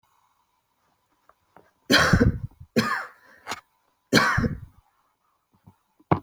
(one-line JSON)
{"three_cough_length": "6.2 s", "three_cough_amplitude": 25390, "three_cough_signal_mean_std_ratio": 0.35, "survey_phase": "beta (2021-08-13 to 2022-03-07)", "age": "18-44", "gender": "Female", "wearing_mask": "No", "symptom_none": true, "smoker_status": "Never smoked", "respiratory_condition_asthma": false, "respiratory_condition_other": false, "recruitment_source": "REACT", "submission_delay": "3 days", "covid_test_result": "Negative", "covid_test_method": "RT-qPCR"}